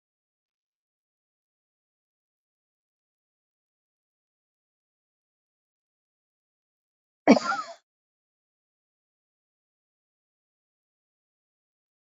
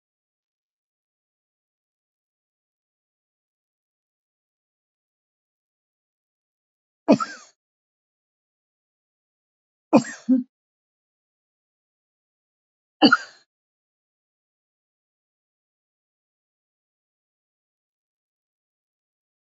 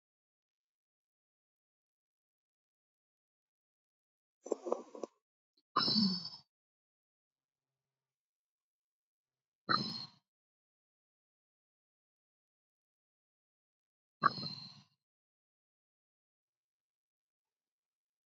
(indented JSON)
{
  "cough_length": "12.0 s",
  "cough_amplitude": 26131,
  "cough_signal_mean_std_ratio": 0.1,
  "three_cough_length": "19.5 s",
  "three_cough_amplitude": 27109,
  "three_cough_signal_mean_std_ratio": 0.12,
  "exhalation_length": "18.3 s",
  "exhalation_amplitude": 6828,
  "exhalation_signal_mean_std_ratio": 0.19,
  "survey_phase": "beta (2021-08-13 to 2022-03-07)",
  "age": "65+",
  "gender": "Female",
  "wearing_mask": "No",
  "symptom_none": true,
  "smoker_status": "Ex-smoker",
  "respiratory_condition_asthma": false,
  "respiratory_condition_other": false,
  "recruitment_source": "REACT",
  "submission_delay": "10 days",
  "covid_test_result": "Negative",
  "covid_test_method": "RT-qPCR"
}